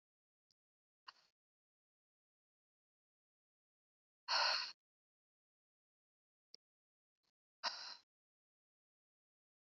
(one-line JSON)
{"exhalation_length": "9.7 s", "exhalation_amplitude": 2031, "exhalation_signal_mean_std_ratio": 0.19, "survey_phase": "beta (2021-08-13 to 2022-03-07)", "age": "18-44", "gender": "Female", "wearing_mask": "No", "symptom_cough_any": true, "symptom_runny_or_blocked_nose": true, "symptom_fatigue": true, "symptom_headache": true, "symptom_change_to_sense_of_smell_or_taste": true, "symptom_onset": "4 days", "smoker_status": "Never smoked", "respiratory_condition_asthma": false, "respiratory_condition_other": false, "recruitment_source": "Test and Trace", "submission_delay": "4 days", "covid_test_result": "Positive", "covid_test_method": "RT-qPCR"}